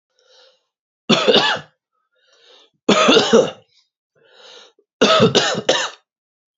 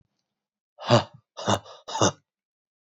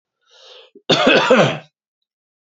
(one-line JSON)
{"three_cough_length": "6.6 s", "three_cough_amplitude": 32767, "three_cough_signal_mean_std_ratio": 0.42, "exhalation_length": "2.9 s", "exhalation_amplitude": 17599, "exhalation_signal_mean_std_ratio": 0.31, "cough_length": "2.6 s", "cough_amplitude": 29766, "cough_signal_mean_std_ratio": 0.42, "survey_phase": "beta (2021-08-13 to 2022-03-07)", "age": "18-44", "gender": "Male", "wearing_mask": "No", "symptom_runny_or_blocked_nose": true, "symptom_onset": "4 days", "smoker_status": "Never smoked", "respiratory_condition_asthma": false, "respiratory_condition_other": false, "recruitment_source": "REACT", "submission_delay": "1 day", "covid_test_result": "Negative", "covid_test_method": "RT-qPCR", "influenza_a_test_result": "Negative", "influenza_b_test_result": "Negative"}